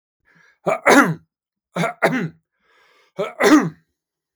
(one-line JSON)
{"three_cough_length": "4.4 s", "three_cough_amplitude": 32766, "three_cough_signal_mean_std_ratio": 0.39, "survey_phase": "beta (2021-08-13 to 2022-03-07)", "age": "18-44", "gender": "Male", "wearing_mask": "No", "symptom_none": true, "smoker_status": "Never smoked", "respiratory_condition_asthma": false, "respiratory_condition_other": false, "recruitment_source": "REACT", "submission_delay": "0 days", "covid_test_result": "Negative", "covid_test_method": "RT-qPCR", "influenza_a_test_result": "Negative", "influenza_b_test_result": "Negative"}